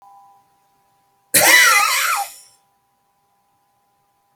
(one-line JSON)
{"cough_length": "4.4 s", "cough_amplitude": 32768, "cough_signal_mean_std_ratio": 0.37, "survey_phase": "alpha (2021-03-01 to 2021-08-12)", "age": "65+", "gender": "Male", "wearing_mask": "No", "symptom_fatigue": true, "symptom_fever_high_temperature": true, "symptom_change_to_sense_of_smell_or_taste": true, "symptom_onset": "3 days", "smoker_status": "Never smoked", "respiratory_condition_asthma": false, "respiratory_condition_other": false, "recruitment_source": "Test and Trace", "submission_delay": "1 day", "covid_test_result": "Positive", "covid_test_method": "RT-qPCR", "covid_ct_value": 16.0, "covid_ct_gene": "N gene", "covid_ct_mean": 17.7, "covid_viral_load": "1600000 copies/ml", "covid_viral_load_category": "High viral load (>1M copies/ml)"}